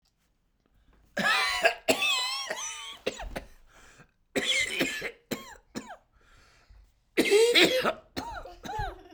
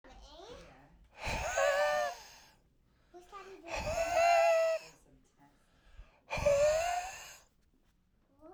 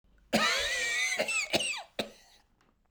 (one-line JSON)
{"three_cough_length": "9.1 s", "three_cough_amplitude": 16330, "three_cough_signal_mean_std_ratio": 0.5, "exhalation_length": "8.5 s", "exhalation_amplitude": 4211, "exhalation_signal_mean_std_ratio": 0.54, "cough_length": "2.9 s", "cough_amplitude": 7208, "cough_signal_mean_std_ratio": 0.65, "survey_phase": "beta (2021-08-13 to 2022-03-07)", "age": "45-64", "gender": "Male", "wearing_mask": "No", "symptom_cough_any": true, "symptom_runny_or_blocked_nose": true, "symptom_sore_throat": true, "symptom_headache": true, "symptom_change_to_sense_of_smell_or_taste": true, "symptom_onset": "12 days", "smoker_status": "Never smoked", "respiratory_condition_asthma": false, "respiratory_condition_other": false, "recruitment_source": "REACT", "submission_delay": "4 days", "covid_test_result": "Negative", "covid_test_method": "RT-qPCR"}